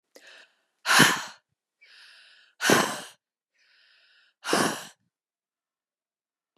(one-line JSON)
{"exhalation_length": "6.6 s", "exhalation_amplitude": 25432, "exhalation_signal_mean_std_ratio": 0.3, "survey_phase": "beta (2021-08-13 to 2022-03-07)", "age": "45-64", "gender": "Female", "wearing_mask": "No", "symptom_headache": true, "smoker_status": "Current smoker (1 to 10 cigarettes per day)", "respiratory_condition_asthma": false, "respiratory_condition_other": false, "recruitment_source": "Test and Trace", "submission_delay": "1 day", "covid_test_result": "Positive", "covid_test_method": "RT-qPCR", "covid_ct_value": 32.4, "covid_ct_gene": "ORF1ab gene"}